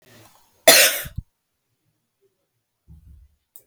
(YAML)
cough_length: 3.7 s
cough_amplitude: 32768
cough_signal_mean_std_ratio: 0.23
survey_phase: beta (2021-08-13 to 2022-03-07)
age: 65+
gender: Female
wearing_mask: 'No'
symptom_none: true
smoker_status: Never smoked
respiratory_condition_asthma: false
respiratory_condition_other: false
recruitment_source: REACT
submission_delay: 0 days
covid_test_result: Negative
covid_test_method: RT-qPCR